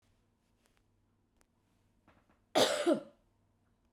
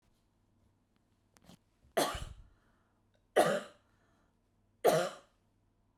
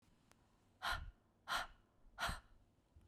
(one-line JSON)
{"cough_length": "3.9 s", "cough_amplitude": 6012, "cough_signal_mean_std_ratio": 0.26, "three_cough_length": "6.0 s", "three_cough_amplitude": 7412, "three_cough_signal_mean_std_ratio": 0.28, "exhalation_length": "3.1 s", "exhalation_amplitude": 1296, "exhalation_signal_mean_std_ratio": 0.42, "survey_phase": "beta (2021-08-13 to 2022-03-07)", "age": "45-64", "gender": "Female", "wearing_mask": "No", "symptom_none": true, "smoker_status": "Ex-smoker", "respiratory_condition_asthma": false, "respiratory_condition_other": false, "recruitment_source": "REACT", "submission_delay": "2 days", "covid_test_result": "Negative", "covid_test_method": "RT-qPCR", "influenza_a_test_result": "Unknown/Void", "influenza_b_test_result": "Unknown/Void"}